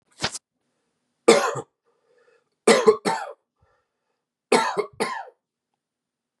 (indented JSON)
{
  "three_cough_length": "6.4 s",
  "three_cough_amplitude": 29377,
  "three_cough_signal_mean_std_ratio": 0.31,
  "survey_phase": "beta (2021-08-13 to 2022-03-07)",
  "age": "18-44",
  "gender": "Male",
  "wearing_mask": "No",
  "symptom_cough_any": true,
  "symptom_runny_or_blocked_nose": true,
  "symptom_shortness_of_breath": true,
  "symptom_sore_throat": true,
  "symptom_abdominal_pain": true,
  "symptom_diarrhoea": true,
  "symptom_fatigue": true,
  "symptom_headache": true,
  "symptom_onset": "3 days",
  "smoker_status": "Ex-smoker",
  "respiratory_condition_asthma": false,
  "respiratory_condition_other": false,
  "recruitment_source": "Test and Trace",
  "submission_delay": "2 days",
  "covid_test_result": "Positive",
  "covid_test_method": "RT-qPCR",
  "covid_ct_value": 20.9,
  "covid_ct_gene": "ORF1ab gene",
  "covid_ct_mean": 21.9,
  "covid_viral_load": "67000 copies/ml",
  "covid_viral_load_category": "Low viral load (10K-1M copies/ml)"
}